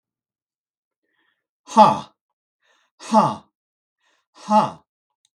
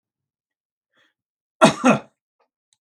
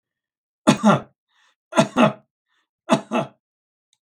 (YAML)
exhalation_length: 5.4 s
exhalation_amplitude: 32766
exhalation_signal_mean_std_ratio: 0.26
cough_length: 2.8 s
cough_amplitude: 32768
cough_signal_mean_std_ratio: 0.23
three_cough_length: 4.0 s
three_cough_amplitude: 32766
three_cough_signal_mean_std_ratio: 0.33
survey_phase: beta (2021-08-13 to 2022-03-07)
age: 65+
gender: Male
wearing_mask: 'No'
symptom_none: true
smoker_status: Ex-smoker
respiratory_condition_asthma: false
respiratory_condition_other: false
recruitment_source: REACT
submission_delay: 1 day
covid_test_result: Negative
covid_test_method: RT-qPCR
influenza_a_test_result: Negative
influenza_b_test_result: Negative